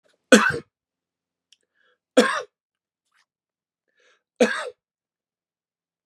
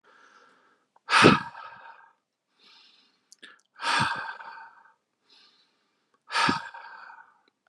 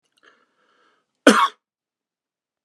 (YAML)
three_cough_length: 6.1 s
three_cough_amplitude: 32767
three_cough_signal_mean_std_ratio: 0.22
exhalation_length: 7.7 s
exhalation_amplitude: 24439
exhalation_signal_mean_std_ratio: 0.29
cough_length: 2.6 s
cough_amplitude: 32767
cough_signal_mean_std_ratio: 0.21
survey_phase: beta (2021-08-13 to 2022-03-07)
age: 18-44
gender: Male
wearing_mask: 'No'
symptom_cough_any: true
symptom_runny_or_blocked_nose: true
symptom_onset: 10 days
smoker_status: Never smoked
respiratory_condition_asthma: false
respiratory_condition_other: false
recruitment_source: REACT
submission_delay: 1 day
covid_test_method: RT-qPCR